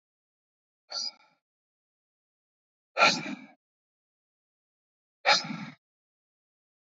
exhalation_length: 7.0 s
exhalation_amplitude: 14679
exhalation_signal_mean_std_ratio: 0.23
survey_phase: beta (2021-08-13 to 2022-03-07)
age: 45-64
gender: Male
wearing_mask: 'No'
symptom_cough_any: true
symptom_new_continuous_cough: true
symptom_runny_or_blocked_nose: true
symptom_shortness_of_breath: true
symptom_sore_throat: true
symptom_fatigue: true
symptom_fever_high_temperature: true
symptom_headache: true
symptom_change_to_sense_of_smell_or_taste: true
smoker_status: Ex-smoker
respiratory_condition_asthma: true
respiratory_condition_other: false
recruitment_source: Test and Trace
submission_delay: 2 days
covid_test_result: Positive
covid_test_method: RT-qPCR
covid_ct_value: 24.7
covid_ct_gene: ORF1ab gene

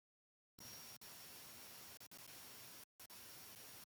cough_length: 3.9 s
cough_amplitude: 234
cough_signal_mean_std_ratio: 0.93
survey_phase: beta (2021-08-13 to 2022-03-07)
age: 65+
gender: Male
wearing_mask: 'No'
symptom_none: true
smoker_status: Ex-smoker
respiratory_condition_asthma: false
respiratory_condition_other: false
recruitment_source: REACT
submission_delay: 2 days
covid_test_result: Negative
covid_test_method: RT-qPCR
influenza_a_test_result: Negative
influenza_b_test_result: Negative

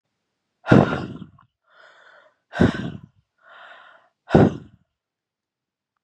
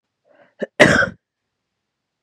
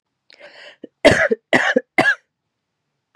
exhalation_length: 6.0 s
exhalation_amplitude: 32767
exhalation_signal_mean_std_ratio: 0.27
cough_length: 2.2 s
cough_amplitude: 32768
cough_signal_mean_std_ratio: 0.28
three_cough_length: 3.2 s
three_cough_amplitude: 32768
three_cough_signal_mean_std_ratio: 0.36
survey_phase: beta (2021-08-13 to 2022-03-07)
age: 18-44
gender: Female
wearing_mask: 'No'
symptom_cough_any: true
symptom_runny_or_blocked_nose: true
symptom_sore_throat: true
symptom_onset: 2 days
smoker_status: Never smoked
respiratory_condition_asthma: true
respiratory_condition_other: false
recruitment_source: Test and Trace
submission_delay: 1 day
covid_test_result: Positive
covid_test_method: RT-qPCR
covid_ct_value: 22.5
covid_ct_gene: ORF1ab gene
covid_ct_mean: 22.8
covid_viral_load: 34000 copies/ml
covid_viral_load_category: Low viral load (10K-1M copies/ml)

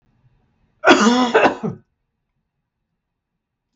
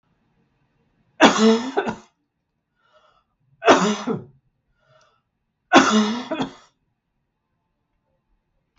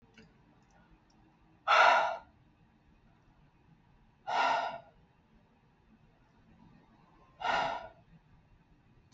cough_length: 3.8 s
cough_amplitude: 32768
cough_signal_mean_std_ratio: 0.35
three_cough_length: 8.8 s
three_cough_amplitude: 32768
three_cough_signal_mean_std_ratio: 0.32
exhalation_length: 9.1 s
exhalation_amplitude: 9795
exhalation_signal_mean_std_ratio: 0.31
survey_phase: beta (2021-08-13 to 2022-03-07)
age: 65+
gender: Female
wearing_mask: 'No'
symptom_none: true
smoker_status: Never smoked
respiratory_condition_asthma: false
respiratory_condition_other: false
recruitment_source: REACT
submission_delay: 2 days
covid_test_result: Negative
covid_test_method: RT-qPCR
influenza_a_test_result: Negative
influenza_b_test_result: Negative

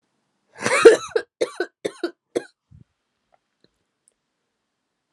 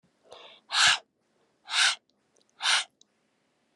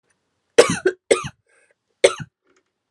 cough_length: 5.1 s
cough_amplitude: 32768
cough_signal_mean_std_ratio: 0.22
exhalation_length: 3.8 s
exhalation_amplitude: 14355
exhalation_signal_mean_std_ratio: 0.35
three_cough_length: 2.9 s
three_cough_amplitude: 32768
three_cough_signal_mean_std_ratio: 0.26
survey_phase: alpha (2021-03-01 to 2021-08-12)
age: 18-44
gender: Female
wearing_mask: 'No'
symptom_cough_any: true
symptom_shortness_of_breath: true
symptom_fatigue: true
symptom_fever_high_temperature: true
symptom_headache: true
symptom_change_to_sense_of_smell_or_taste: true
symptom_loss_of_taste: true
symptom_onset: 3 days
smoker_status: Current smoker (1 to 10 cigarettes per day)
respiratory_condition_asthma: false
respiratory_condition_other: false
recruitment_source: Test and Trace
submission_delay: 2 days
covid_test_result: Positive
covid_test_method: RT-qPCR
covid_ct_value: 12.0
covid_ct_gene: ORF1ab gene
covid_ct_mean: 12.4
covid_viral_load: 85000000 copies/ml
covid_viral_load_category: High viral load (>1M copies/ml)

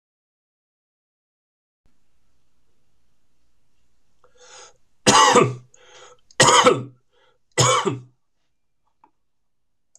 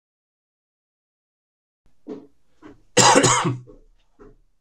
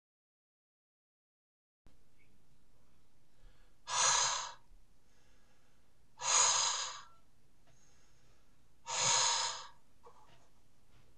three_cough_length: 10.0 s
three_cough_amplitude: 26028
three_cough_signal_mean_std_ratio: 0.29
cough_length: 4.6 s
cough_amplitude: 26028
cough_signal_mean_std_ratio: 0.3
exhalation_length: 11.2 s
exhalation_amplitude: 4985
exhalation_signal_mean_std_ratio: 0.47
survey_phase: beta (2021-08-13 to 2022-03-07)
age: 45-64
gender: Male
wearing_mask: 'No'
symptom_none: true
smoker_status: Current smoker (11 or more cigarettes per day)
respiratory_condition_asthma: false
respiratory_condition_other: false
recruitment_source: REACT
submission_delay: 2 days
covid_test_result: Negative
covid_test_method: RT-qPCR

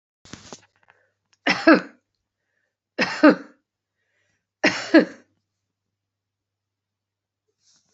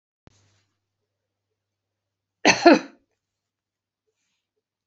three_cough_length: 7.9 s
three_cough_amplitude: 28089
three_cough_signal_mean_std_ratio: 0.23
cough_length: 4.9 s
cough_amplitude: 28241
cough_signal_mean_std_ratio: 0.18
survey_phase: beta (2021-08-13 to 2022-03-07)
age: 45-64
gender: Female
wearing_mask: 'No'
symptom_runny_or_blocked_nose: true
symptom_onset: 5 days
smoker_status: Never smoked
respiratory_condition_asthma: true
respiratory_condition_other: false
recruitment_source: REACT
submission_delay: 1 day
covid_test_result: Negative
covid_test_method: RT-qPCR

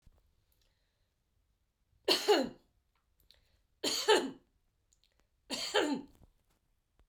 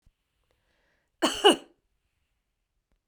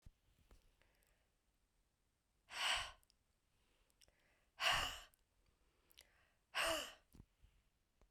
three_cough_length: 7.1 s
three_cough_amplitude: 6705
three_cough_signal_mean_std_ratio: 0.31
cough_length: 3.1 s
cough_amplitude: 18746
cough_signal_mean_std_ratio: 0.2
exhalation_length: 8.1 s
exhalation_amplitude: 1838
exhalation_signal_mean_std_ratio: 0.31
survey_phase: beta (2021-08-13 to 2022-03-07)
age: 45-64
gender: Female
wearing_mask: 'No'
symptom_none: true
smoker_status: Never smoked
respiratory_condition_asthma: true
respiratory_condition_other: false
recruitment_source: REACT
submission_delay: 2 days
covid_test_result: Negative
covid_test_method: RT-qPCR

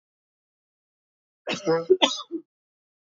cough_length: 3.2 s
cough_amplitude: 23458
cough_signal_mean_std_ratio: 0.3
survey_phase: beta (2021-08-13 to 2022-03-07)
age: 18-44
gender: Female
wearing_mask: 'No'
symptom_fatigue: true
smoker_status: Ex-smoker
respiratory_condition_asthma: false
respiratory_condition_other: false
recruitment_source: REACT
submission_delay: 1 day
covid_test_result: Negative
covid_test_method: RT-qPCR
influenza_a_test_result: Unknown/Void
influenza_b_test_result: Unknown/Void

